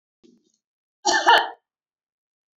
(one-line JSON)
{"cough_length": "2.6 s", "cough_amplitude": 24591, "cough_signal_mean_std_ratio": 0.3, "survey_phase": "beta (2021-08-13 to 2022-03-07)", "age": "18-44", "gender": "Female", "wearing_mask": "No", "symptom_none": true, "smoker_status": "Never smoked", "respiratory_condition_asthma": true, "respiratory_condition_other": false, "recruitment_source": "REACT", "submission_delay": "2 days", "covid_test_result": "Negative", "covid_test_method": "RT-qPCR"}